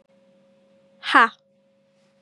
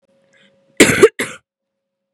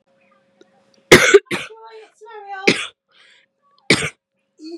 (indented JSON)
{
  "exhalation_length": "2.2 s",
  "exhalation_amplitude": 27873,
  "exhalation_signal_mean_std_ratio": 0.22,
  "cough_length": "2.1 s",
  "cough_amplitude": 32768,
  "cough_signal_mean_std_ratio": 0.29,
  "three_cough_length": "4.8 s",
  "three_cough_amplitude": 32768,
  "three_cough_signal_mean_std_ratio": 0.28,
  "survey_phase": "beta (2021-08-13 to 2022-03-07)",
  "age": "18-44",
  "gender": "Female",
  "wearing_mask": "No",
  "symptom_cough_any": true,
  "symptom_runny_or_blocked_nose": true,
  "symptom_sore_throat": true,
  "symptom_abdominal_pain": true,
  "symptom_fatigue": true,
  "symptom_headache": true,
  "symptom_change_to_sense_of_smell_or_taste": true,
  "symptom_onset": "3 days",
  "smoker_status": "Never smoked",
  "respiratory_condition_asthma": false,
  "respiratory_condition_other": false,
  "recruitment_source": "Test and Trace",
  "submission_delay": "1 day",
  "covid_test_result": "Positive",
  "covid_test_method": "RT-qPCR"
}